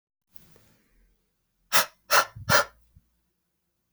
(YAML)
exhalation_length: 3.9 s
exhalation_amplitude: 23225
exhalation_signal_mean_std_ratio: 0.26
survey_phase: beta (2021-08-13 to 2022-03-07)
age: 18-44
gender: Male
wearing_mask: 'No'
symptom_cough_any: true
symptom_runny_or_blocked_nose: true
symptom_fatigue: true
symptom_other: true
smoker_status: Never smoked
respiratory_condition_asthma: false
respiratory_condition_other: false
recruitment_source: Test and Trace
submission_delay: 2 days
covid_test_result: Positive
covid_test_method: RT-qPCR
covid_ct_value: 23.9
covid_ct_gene: N gene